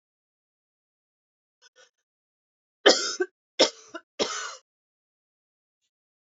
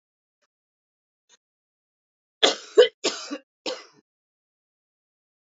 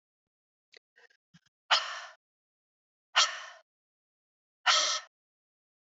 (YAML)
three_cough_length: 6.3 s
three_cough_amplitude: 25400
three_cough_signal_mean_std_ratio: 0.21
cough_length: 5.5 s
cough_amplitude: 31593
cough_signal_mean_std_ratio: 0.19
exhalation_length: 5.9 s
exhalation_amplitude: 10120
exhalation_signal_mean_std_ratio: 0.27
survey_phase: beta (2021-08-13 to 2022-03-07)
age: 18-44
gender: Female
wearing_mask: 'No'
symptom_cough_any: true
symptom_runny_or_blocked_nose: true
symptom_sore_throat: true
symptom_onset: 9 days
smoker_status: Never smoked
respiratory_condition_asthma: false
respiratory_condition_other: false
recruitment_source: REACT
submission_delay: 1 day
covid_test_result: Negative
covid_test_method: RT-qPCR
influenza_a_test_result: Negative
influenza_b_test_result: Negative